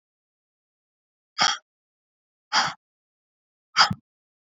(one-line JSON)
{"exhalation_length": "4.4 s", "exhalation_amplitude": 26975, "exhalation_signal_mean_std_ratio": 0.24, "survey_phase": "beta (2021-08-13 to 2022-03-07)", "age": "45-64", "gender": "Female", "wearing_mask": "No", "symptom_none": true, "smoker_status": "Never smoked", "respiratory_condition_asthma": false, "respiratory_condition_other": true, "recruitment_source": "REACT", "submission_delay": "1 day", "covid_test_result": "Negative", "covid_test_method": "RT-qPCR", "influenza_a_test_result": "Negative", "influenza_b_test_result": "Negative"}